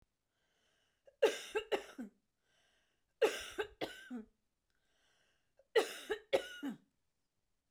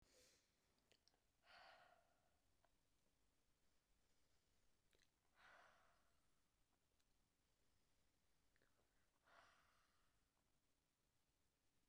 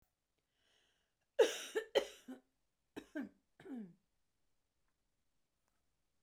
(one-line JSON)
{"three_cough_length": "7.7 s", "three_cough_amplitude": 4107, "three_cough_signal_mean_std_ratio": 0.3, "exhalation_length": "11.9 s", "exhalation_amplitude": 58, "exhalation_signal_mean_std_ratio": 0.74, "cough_length": "6.2 s", "cough_amplitude": 4224, "cough_signal_mean_std_ratio": 0.22, "survey_phase": "beta (2021-08-13 to 2022-03-07)", "age": "45-64", "gender": "Female", "wearing_mask": "No", "symptom_cough_any": true, "symptom_runny_or_blocked_nose": true, "smoker_status": "Never smoked", "respiratory_condition_asthma": false, "respiratory_condition_other": false, "recruitment_source": "REACT", "submission_delay": "2 days", "covid_test_result": "Negative", "covid_test_method": "RT-qPCR"}